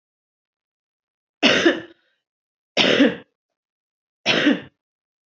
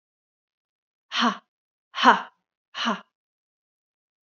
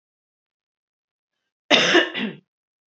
three_cough_length: 5.3 s
three_cough_amplitude: 30638
three_cough_signal_mean_std_ratio: 0.35
exhalation_length: 4.3 s
exhalation_amplitude: 31208
exhalation_signal_mean_std_ratio: 0.25
cough_length: 2.9 s
cough_amplitude: 27685
cough_signal_mean_std_ratio: 0.32
survey_phase: beta (2021-08-13 to 2022-03-07)
age: 18-44
gender: Female
wearing_mask: 'No'
symptom_none: true
symptom_onset: 10 days
smoker_status: Ex-smoker
respiratory_condition_asthma: false
respiratory_condition_other: false
recruitment_source: REACT
submission_delay: 2 days
covid_test_result: Negative
covid_test_method: RT-qPCR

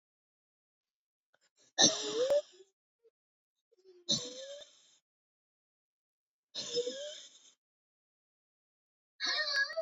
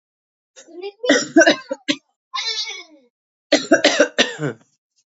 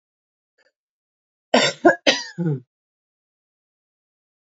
exhalation_length: 9.8 s
exhalation_amplitude: 9232
exhalation_signal_mean_std_ratio: 0.33
three_cough_length: 5.1 s
three_cough_amplitude: 29527
three_cough_signal_mean_std_ratio: 0.4
cough_length: 4.5 s
cough_amplitude: 27076
cough_signal_mean_std_ratio: 0.26
survey_phase: beta (2021-08-13 to 2022-03-07)
age: 18-44
gender: Female
wearing_mask: 'No'
symptom_cough_any: true
symptom_runny_or_blocked_nose: true
symptom_fatigue: true
symptom_onset: 3 days
smoker_status: Never smoked
respiratory_condition_asthma: false
respiratory_condition_other: false
recruitment_source: Test and Trace
submission_delay: 1 day
covid_test_result: Positive
covid_test_method: RT-qPCR
covid_ct_value: 23.6
covid_ct_gene: N gene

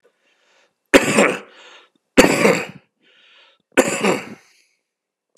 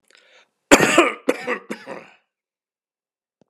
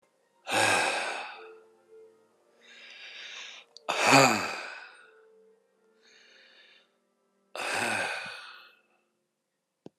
three_cough_length: 5.4 s
three_cough_amplitude: 32768
three_cough_signal_mean_std_ratio: 0.35
cough_length: 3.5 s
cough_amplitude: 32768
cough_signal_mean_std_ratio: 0.3
exhalation_length: 10.0 s
exhalation_amplitude: 18565
exhalation_signal_mean_std_ratio: 0.37
survey_phase: alpha (2021-03-01 to 2021-08-12)
age: 65+
gender: Male
wearing_mask: 'No'
symptom_none: true
smoker_status: Ex-smoker
respiratory_condition_asthma: false
respiratory_condition_other: false
recruitment_source: REACT
submission_delay: 1 day
covid_test_result: Negative
covid_test_method: RT-qPCR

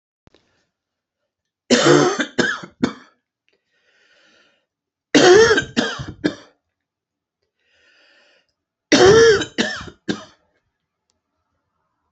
three_cough_length: 12.1 s
three_cough_amplitude: 30921
three_cough_signal_mean_std_ratio: 0.34
survey_phase: alpha (2021-03-01 to 2021-08-12)
age: 65+
gender: Male
wearing_mask: 'No'
symptom_headache: true
symptom_change_to_sense_of_smell_or_taste: true
symptom_loss_of_taste: true
smoker_status: Never smoked
respiratory_condition_asthma: false
respiratory_condition_other: false
recruitment_source: Test and Trace
submission_delay: 2 days
covid_test_result: Positive
covid_test_method: RT-qPCR
covid_ct_value: 21.5
covid_ct_gene: ORF1ab gene
covid_ct_mean: 22.1
covid_viral_load: 56000 copies/ml
covid_viral_load_category: Low viral load (10K-1M copies/ml)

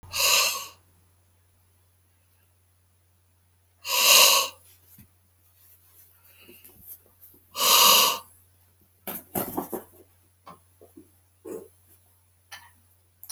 exhalation_length: 13.3 s
exhalation_amplitude: 23116
exhalation_signal_mean_std_ratio: 0.31
survey_phase: beta (2021-08-13 to 2022-03-07)
age: 65+
gender: Male
wearing_mask: 'No'
symptom_none: true
smoker_status: Ex-smoker
respiratory_condition_asthma: false
respiratory_condition_other: false
recruitment_source: REACT
submission_delay: 1 day
covid_test_result: Negative
covid_test_method: RT-qPCR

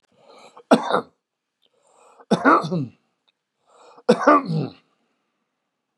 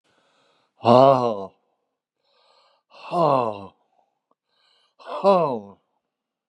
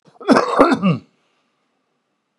three_cough_length: 6.0 s
three_cough_amplitude: 31554
three_cough_signal_mean_std_ratio: 0.33
exhalation_length: 6.5 s
exhalation_amplitude: 29787
exhalation_signal_mean_std_ratio: 0.32
cough_length: 2.4 s
cough_amplitude: 32768
cough_signal_mean_std_ratio: 0.41
survey_phase: beta (2021-08-13 to 2022-03-07)
age: 65+
gender: Male
wearing_mask: 'No'
symptom_cough_any: true
symptom_shortness_of_breath: true
smoker_status: Current smoker (11 or more cigarettes per day)
respiratory_condition_asthma: false
respiratory_condition_other: false
recruitment_source: REACT
submission_delay: 5 days
covid_test_result: Negative
covid_test_method: RT-qPCR
influenza_a_test_result: Negative
influenza_b_test_result: Negative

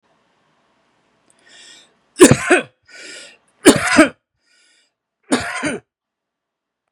three_cough_length: 6.9 s
three_cough_amplitude: 32768
three_cough_signal_mean_std_ratio: 0.28
survey_phase: beta (2021-08-13 to 2022-03-07)
age: 18-44
gender: Male
wearing_mask: 'No'
symptom_runny_or_blocked_nose: true
symptom_fatigue: true
symptom_onset: 5 days
smoker_status: Current smoker (11 or more cigarettes per day)
respiratory_condition_asthma: true
respiratory_condition_other: false
recruitment_source: REACT
submission_delay: 2 days
covid_test_result: Negative
covid_test_method: RT-qPCR
influenza_a_test_result: Negative
influenza_b_test_result: Negative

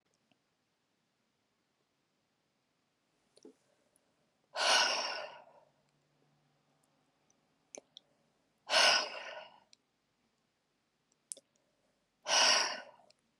exhalation_length: 13.4 s
exhalation_amplitude: 6518
exhalation_signal_mean_std_ratio: 0.27
survey_phase: alpha (2021-03-01 to 2021-08-12)
age: 18-44
gender: Female
wearing_mask: 'No'
symptom_diarrhoea: true
smoker_status: Never smoked
respiratory_condition_asthma: false
respiratory_condition_other: false
recruitment_source: REACT
submission_delay: 1 day
covid_test_result: Negative
covid_test_method: RT-qPCR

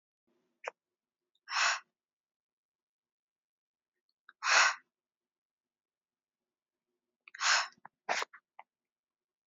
exhalation_length: 9.5 s
exhalation_amplitude: 7995
exhalation_signal_mean_std_ratio: 0.25
survey_phase: beta (2021-08-13 to 2022-03-07)
age: 18-44
gender: Female
wearing_mask: 'No'
symptom_none: true
smoker_status: Never smoked
respiratory_condition_asthma: false
respiratory_condition_other: false
recruitment_source: REACT
submission_delay: 2 days
covid_test_result: Negative
covid_test_method: RT-qPCR
influenza_a_test_result: Negative
influenza_b_test_result: Negative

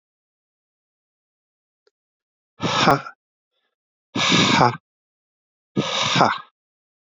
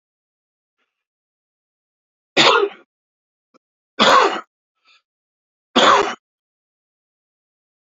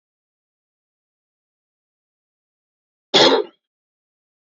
exhalation_length: 7.2 s
exhalation_amplitude: 32768
exhalation_signal_mean_std_ratio: 0.35
three_cough_length: 7.9 s
three_cough_amplitude: 32768
three_cough_signal_mean_std_ratio: 0.29
cough_length: 4.5 s
cough_amplitude: 30154
cough_signal_mean_std_ratio: 0.2
survey_phase: beta (2021-08-13 to 2022-03-07)
age: 45-64
gender: Male
wearing_mask: 'No'
symptom_cough_any: true
symptom_runny_or_blocked_nose: true
symptom_sore_throat: true
symptom_fatigue: true
smoker_status: Never smoked
respiratory_condition_asthma: false
respiratory_condition_other: false
recruitment_source: Test and Trace
submission_delay: 2 days
covid_test_result: Positive
covid_test_method: RT-qPCR
covid_ct_value: 16.9
covid_ct_gene: N gene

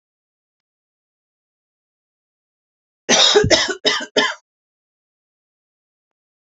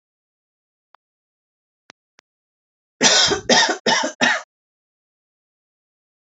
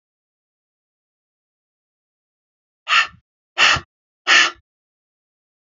cough_length: 6.5 s
cough_amplitude: 32118
cough_signal_mean_std_ratio: 0.3
three_cough_length: 6.2 s
three_cough_amplitude: 32768
three_cough_signal_mean_std_ratio: 0.32
exhalation_length: 5.7 s
exhalation_amplitude: 30116
exhalation_signal_mean_std_ratio: 0.25
survey_phase: beta (2021-08-13 to 2022-03-07)
age: 45-64
gender: Female
wearing_mask: 'No'
symptom_none: true
smoker_status: Ex-smoker
respiratory_condition_asthma: false
respiratory_condition_other: false
recruitment_source: REACT
submission_delay: 1 day
covid_test_result: Negative
covid_test_method: RT-qPCR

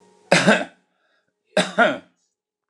cough_length: 2.7 s
cough_amplitude: 29204
cough_signal_mean_std_ratio: 0.36
survey_phase: beta (2021-08-13 to 2022-03-07)
age: 65+
gender: Male
wearing_mask: 'No'
symptom_none: true
smoker_status: Ex-smoker
respiratory_condition_asthma: false
respiratory_condition_other: false
recruitment_source: REACT
submission_delay: 0 days
covid_test_result: Negative
covid_test_method: RT-qPCR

